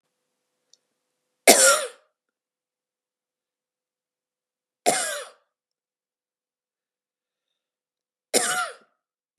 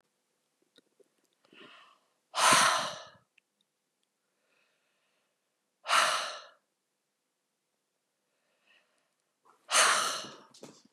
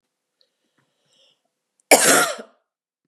three_cough_length: 9.4 s
three_cough_amplitude: 32767
three_cough_signal_mean_std_ratio: 0.22
exhalation_length: 10.9 s
exhalation_amplitude: 11010
exhalation_signal_mean_std_ratio: 0.29
cough_length: 3.1 s
cough_amplitude: 32767
cough_signal_mean_std_ratio: 0.28
survey_phase: beta (2021-08-13 to 2022-03-07)
age: 45-64
gender: Female
wearing_mask: 'No'
symptom_none: true
smoker_status: Never smoked
respiratory_condition_asthma: false
respiratory_condition_other: false
recruitment_source: REACT
submission_delay: 1 day
covid_test_result: Negative
covid_test_method: RT-qPCR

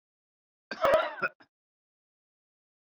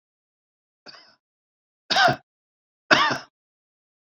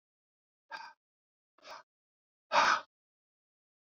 cough_length: 2.8 s
cough_amplitude: 8958
cough_signal_mean_std_ratio: 0.29
three_cough_length: 4.0 s
three_cough_amplitude: 26273
three_cough_signal_mean_std_ratio: 0.28
exhalation_length: 3.8 s
exhalation_amplitude: 6983
exhalation_signal_mean_std_ratio: 0.23
survey_phase: beta (2021-08-13 to 2022-03-07)
age: 45-64
gender: Male
wearing_mask: 'No'
symptom_none: true
smoker_status: Ex-smoker
respiratory_condition_asthma: false
respiratory_condition_other: false
recruitment_source: REACT
submission_delay: 2 days
covid_test_result: Negative
covid_test_method: RT-qPCR
influenza_a_test_result: Negative
influenza_b_test_result: Negative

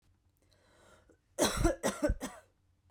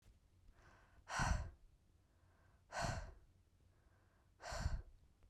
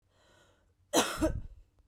three_cough_length: 2.9 s
three_cough_amplitude: 5677
three_cough_signal_mean_std_ratio: 0.39
exhalation_length: 5.3 s
exhalation_amplitude: 1463
exhalation_signal_mean_std_ratio: 0.41
cough_length: 1.9 s
cough_amplitude: 10131
cough_signal_mean_std_ratio: 0.39
survey_phase: beta (2021-08-13 to 2022-03-07)
age: 18-44
gender: Female
wearing_mask: 'No'
symptom_sore_throat: true
symptom_fatigue: true
symptom_onset: 12 days
smoker_status: Never smoked
respiratory_condition_asthma: false
respiratory_condition_other: false
recruitment_source: REACT
submission_delay: 2 days
covid_test_result: Negative
covid_test_method: RT-qPCR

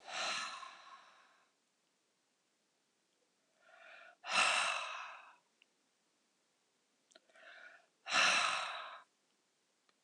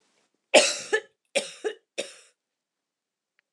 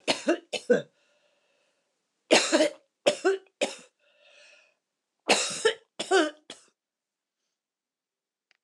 exhalation_length: 10.0 s
exhalation_amplitude: 4102
exhalation_signal_mean_std_ratio: 0.36
cough_length: 3.5 s
cough_amplitude: 23284
cough_signal_mean_std_ratio: 0.27
three_cough_length: 8.6 s
three_cough_amplitude: 16408
three_cough_signal_mean_std_ratio: 0.33
survey_phase: beta (2021-08-13 to 2022-03-07)
age: 65+
gender: Female
wearing_mask: 'No'
symptom_cough_any: true
symptom_runny_or_blocked_nose: true
symptom_onset: 12 days
smoker_status: Never smoked
respiratory_condition_asthma: false
respiratory_condition_other: false
recruitment_source: REACT
submission_delay: 2 days
covid_test_result: Negative
covid_test_method: RT-qPCR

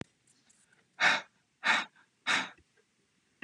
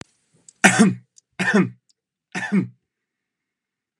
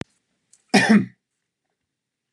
exhalation_length: 3.4 s
exhalation_amplitude: 7541
exhalation_signal_mean_std_ratio: 0.34
three_cough_length: 4.0 s
three_cough_amplitude: 32768
three_cough_signal_mean_std_ratio: 0.35
cough_length: 2.3 s
cough_amplitude: 27082
cough_signal_mean_std_ratio: 0.29
survey_phase: beta (2021-08-13 to 2022-03-07)
age: 18-44
gender: Female
wearing_mask: 'No'
symptom_none: true
smoker_status: Never smoked
respiratory_condition_asthma: false
respiratory_condition_other: false
recruitment_source: Test and Trace
submission_delay: 4 days
covid_test_result: Negative
covid_test_method: RT-qPCR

